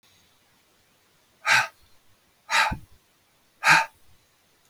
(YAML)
exhalation_length: 4.7 s
exhalation_amplitude: 22745
exhalation_signal_mean_std_ratio: 0.3
survey_phase: beta (2021-08-13 to 2022-03-07)
age: 45-64
gender: Male
wearing_mask: 'No'
symptom_none: true
smoker_status: Never smoked
respiratory_condition_asthma: false
respiratory_condition_other: false
recruitment_source: REACT
submission_delay: 1 day
covid_test_result: Negative
covid_test_method: RT-qPCR
influenza_a_test_result: Negative
influenza_b_test_result: Negative